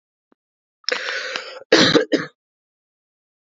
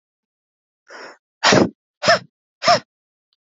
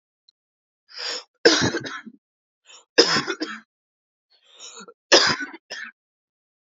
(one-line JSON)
{"cough_length": "3.5 s", "cough_amplitude": 27498, "cough_signal_mean_std_ratio": 0.35, "exhalation_length": "3.6 s", "exhalation_amplitude": 27585, "exhalation_signal_mean_std_ratio": 0.31, "three_cough_length": "6.7 s", "three_cough_amplitude": 32607, "three_cough_signal_mean_std_ratio": 0.32, "survey_phase": "beta (2021-08-13 to 2022-03-07)", "age": "18-44", "gender": "Female", "wearing_mask": "No", "symptom_cough_any": true, "symptom_runny_or_blocked_nose": true, "symptom_shortness_of_breath": true, "symptom_sore_throat": true, "symptom_onset": "6 days", "smoker_status": "Never smoked", "respiratory_condition_asthma": false, "respiratory_condition_other": false, "recruitment_source": "REACT", "submission_delay": "0 days", "covid_test_result": "Negative", "covid_test_method": "RT-qPCR"}